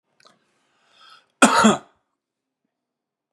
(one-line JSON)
{"cough_length": "3.3 s", "cough_amplitude": 32734, "cough_signal_mean_std_ratio": 0.25, "survey_phase": "beta (2021-08-13 to 2022-03-07)", "age": "65+", "gender": "Male", "wearing_mask": "No", "symptom_runny_or_blocked_nose": true, "smoker_status": "Ex-smoker", "respiratory_condition_asthma": false, "respiratory_condition_other": false, "recruitment_source": "Test and Trace", "submission_delay": "2 days", "covid_test_result": "Negative", "covid_test_method": "RT-qPCR"}